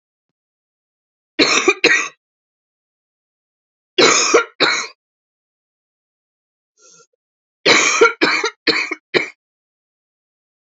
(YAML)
three_cough_length: 10.7 s
three_cough_amplitude: 32768
three_cough_signal_mean_std_ratio: 0.36
survey_phase: alpha (2021-03-01 to 2021-08-12)
age: 45-64
gender: Female
wearing_mask: 'No'
symptom_cough_any: true
symptom_abdominal_pain: true
symptom_fatigue: true
symptom_fever_high_temperature: true
symptom_headache: true
symptom_change_to_sense_of_smell_or_taste: true
symptom_loss_of_taste: true
symptom_onset: 4 days
smoker_status: Ex-smoker
respiratory_condition_asthma: false
respiratory_condition_other: false
recruitment_source: Test and Trace
submission_delay: 1 day
covid_test_result: Positive
covid_test_method: RT-qPCR
covid_ct_value: 14.0
covid_ct_gene: N gene
covid_ct_mean: 14.4
covid_viral_load: 19000000 copies/ml
covid_viral_load_category: High viral load (>1M copies/ml)